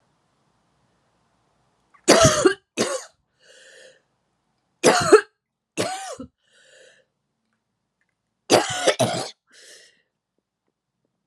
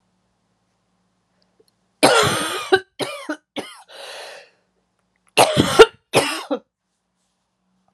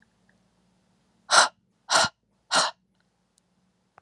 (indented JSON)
{
  "three_cough_length": "11.3 s",
  "three_cough_amplitude": 32663,
  "three_cough_signal_mean_std_ratio": 0.29,
  "cough_length": "7.9 s",
  "cough_amplitude": 32768,
  "cough_signal_mean_std_ratio": 0.31,
  "exhalation_length": "4.0 s",
  "exhalation_amplitude": 20864,
  "exhalation_signal_mean_std_ratio": 0.28,
  "survey_phase": "alpha (2021-03-01 to 2021-08-12)",
  "age": "18-44",
  "gender": "Female",
  "wearing_mask": "No",
  "symptom_cough_any": true,
  "symptom_abdominal_pain": true,
  "symptom_headache": true,
  "symptom_change_to_sense_of_smell_or_taste": true,
  "symptom_onset": "4 days",
  "smoker_status": "Never smoked",
  "respiratory_condition_asthma": false,
  "respiratory_condition_other": false,
  "recruitment_source": "Test and Trace",
  "submission_delay": "2 days",
  "covid_test_result": "Positive",
  "covid_test_method": "RT-qPCR"
}